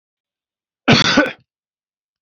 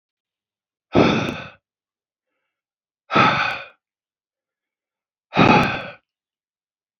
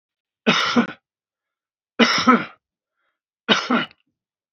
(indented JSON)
{
  "cough_length": "2.2 s",
  "cough_amplitude": 30051,
  "cough_signal_mean_std_ratio": 0.33,
  "exhalation_length": "7.0 s",
  "exhalation_amplitude": 27731,
  "exhalation_signal_mean_std_ratio": 0.33,
  "three_cough_length": "4.5 s",
  "three_cough_amplitude": 27488,
  "three_cough_signal_mean_std_ratio": 0.38,
  "survey_phase": "beta (2021-08-13 to 2022-03-07)",
  "age": "65+",
  "gender": "Male",
  "wearing_mask": "No",
  "symptom_cough_any": true,
  "symptom_sore_throat": true,
  "symptom_onset": "12 days",
  "smoker_status": "Ex-smoker",
  "respiratory_condition_asthma": false,
  "respiratory_condition_other": false,
  "recruitment_source": "REACT",
  "submission_delay": "2 days",
  "covid_test_result": "Negative",
  "covid_test_method": "RT-qPCR",
  "influenza_a_test_result": "Negative",
  "influenza_b_test_result": "Negative"
}